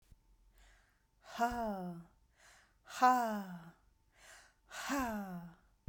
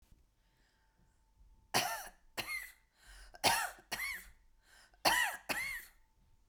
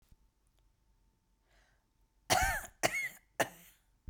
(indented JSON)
{
  "exhalation_length": "5.9 s",
  "exhalation_amplitude": 5959,
  "exhalation_signal_mean_std_ratio": 0.42,
  "three_cough_length": "6.5 s",
  "three_cough_amplitude": 5658,
  "three_cough_signal_mean_std_ratio": 0.41,
  "cough_length": "4.1 s",
  "cough_amplitude": 7567,
  "cough_signal_mean_std_ratio": 0.32,
  "survey_phase": "beta (2021-08-13 to 2022-03-07)",
  "age": "45-64",
  "gender": "Female",
  "wearing_mask": "No",
  "symptom_none": true,
  "symptom_onset": "12 days",
  "smoker_status": "Never smoked",
  "respiratory_condition_asthma": true,
  "respiratory_condition_other": false,
  "recruitment_source": "REACT",
  "submission_delay": "7 days",
  "covid_test_result": "Negative",
  "covid_test_method": "RT-qPCR",
  "influenza_a_test_result": "Negative",
  "influenza_b_test_result": "Negative"
}